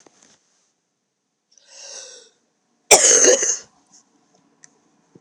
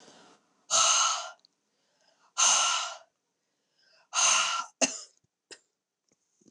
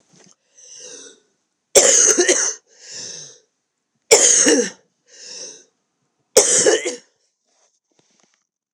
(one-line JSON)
{"cough_length": "5.2 s", "cough_amplitude": 29204, "cough_signal_mean_std_ratio": 0.28, "exhalation_length": "6.5 s", "exhalation_amplitude": 11105, "exhalation_signal_mean_std_ratio": 0.42, "three_cough_length": "8.7 s", "three_cough_amplitude": 29204, "three_cough_signal_mean_std_ratio": 0.38, "survey_phase": "beta (2021-08-13 to 2022-03-07)", "age": "45-64", "gender": "Female", "wearing_mask": "No", "symptom_cough_any": true, "symptom_runny_or_blocked_nose": true, "symptom_sore_throat": true, "symptom_fatigue": true, "symptom_headache": true, "symptom_change_to_sense_of_smell_or_taste": true, "symptom_loss_of_taste": true, "symptom_onset": "5 days", "smoker_status": "Ex-smoker", "respiratory_condition_asthma": false, "respiratory_condition_other": false, "recruitment_source": "Test and Trace", "submission_delay": "2 days", "covid_test_result": "Positive", "covid_test_method": "RT-qPCR", "covid_ct_value": 21.9, "covid_ct_gene": "ORF1ab gene", "covid_ct_mean": 22.5, "covid_viral_load": "43000 copies/ml", "covid_viral_load_category": "Low viral load (10K-1M copies/ml)"}